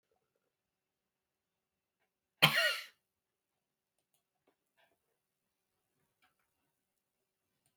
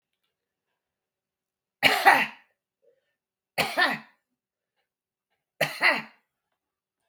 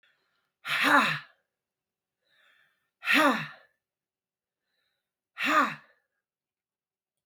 {"cough_length": "7.8 s", "cough_amplitude": 11779, "cough_signal_mean_std_ratio": 0.15, "three_cough_length": "7.1 s", "three_cough_amplitude": 22131, "three_cough_signal_mean_std_ratio": 0.28, "exhalation_length": "7.3 s", "exhalation_amplitude": 12649, "exhalation_signal_mean_std_ratio": 0.32, "survey_phase": "beta (2021-08-13 to 2022-03-07)", "age": "65+", "gender": "Female", "wearing_mask": "No", "symptom_none": true, "smoker_status": "Ex-smoker", "respiratory_condition_asthma": false, "respiratory_condition_other": false, "recruitment_source": "REACT", "submission_delay": "2 days", "covid_test_result": "Negative", "covid_test_method": "RT-qPCR"}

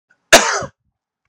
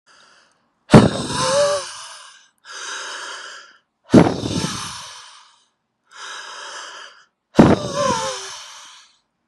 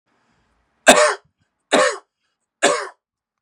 {"cough_length": "1.3 s", "cough_amplitude": 32768, "cough_signal_mean_std_ratio": 0.32, "exhalation_length": "9.5 s", "exhalation_amplitude": 32768, "exhalation_signal_mean_std_ratio": 0.37, "three_cough_length": "3.4 s", "three_cough_amplitude": 32768, "three_cough_signal_mean_std_ratio": 0.33, "survey_phase": "beta (2021-08-13 to 2022-03-07)", "age": "45-64", "gender": "Male", "wearing_mask": "No", "symptom_none": true, "smoker_status": "Ex-smoker", "respiratory_condition_asthma": false, "respiratory_condition_other": false, "recruitment_source": "REACT", "submission_delay": "2 days", "covid_test_result": "Negative", "covid_test_method": "RT-qPCR", "influenza_a_test_result": "Negative", "influenza_b_test_result": "Negative"}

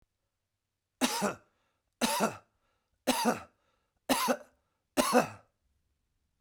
{"cough_length": "6.4 s", "cough_amplitude": 8591, "cough_signal_mean_std_ratio": 0.38, "survey_phase": "beta (2021-08-13 to 2022-03-07)", "age": "65+", "gender": "Male", "wearing_mask": "No", "symptom_none": true, "smoker_status": "Never smoked", "respiratory_condition_asthma": false, "respiratory_condition_other": false, "recruitment_source": "REACT", "submission_delay": "2 days", "covid_test_result": "Negative", "covid_test_method": "RT-qPCR", "influenza_a_test_result": "Negative", "influenza_b_test_result": "Negative"}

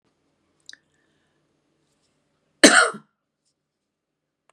{"cough_length": "4.5 s", "cough_amplitude": 32768, "cough_signal_mean_std_ratio": 0.18, "survey_phase": "beta (2021-08-13 to 2022-03-07)", "age": "65+", "gender": "Female", "wearing_mask": "No", "symptom_none": true, "smoker_status": "Ex-smoker", "respiratory_condition_asthma": false, "respiratory_condition_other": false, "recruitment_source": "REACT", "submission_delay": "6 days", "covid_test_result": "Negative", "covid_test_method": "RT-qPCR", "influenza_a_test_result": "Unknown/Void", "influenza_b_test_result": "Unknown/Void"}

